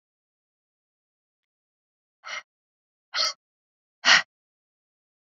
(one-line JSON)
{"exhalation_length": "5.2 s", "exhalation_amplitude": 22063, "exhalation_signal_mean_std_ratio": 0.19, "survey_phase": "beta (2021-08-13 to 2022-03-07)", "age": "45-64", "gender": "Female", "wearing_mask": "No", "symptom_none": true, "smoker_status": "Never smoked", "respiratory_condition_asthma": false, "respiratory_condition_other": false, "recruitment_source": "REACT", "submission_delay": "1 day", "covid_test_result": "Negative", "covid_test_method": "RT-qPCR", "influenza_a_test_result": "Negative", "influenza_b_test_result": "Negative"}